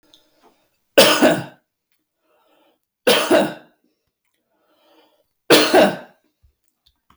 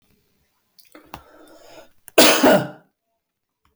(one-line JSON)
{"three_cough_length": "7.2 s", "three_cough_amplitude": 32768, "three_cough_signal_mean_std_ratio": 0.34, "cough_length": "3.8 s", "cough_amplitude": 32768, "cough_signal_mean_std_ratio": 0.29, "survey_phase": "beta (2021-08-13 to 2022-03-07)", "age": "45-64", "gender": "Male", "wearing_mask": "No", "symptom_none": true, "smoker_status": "Never smoked", "respiratory_condition_asthma": false, "respiratory_condition_other": false, "recruitment_source": "REACT", "submission_delay": "1 day", "covid_test_result": "Negative", "covid_test_method": "RT-qPCR"}